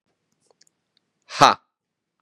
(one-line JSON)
{"exhalation_length": "2.2 s", "exhalation_amplitude": 32768, "exhalation_signal_mean_std_ratio": 0.18, "survey_phase": "beta (2021-08-13 to 2022-03-07)", "age": "18-44", "gender": "Male", "wearing_mask": "No", "symptom_cough_any": true, "symptom_sore_throat": true, "smoker_status": "Never smoked", "respiratory_condition_asthma": false, "respiratory_condition_other": false, "recruitment_source": "Test and Trace", "submission_delay": "2 days", "covid_test_result": "Positive", "covid_test_method": "RT-qPCR", "covid_ct_value": 29.8, "covid_ct_gene": "N gene"}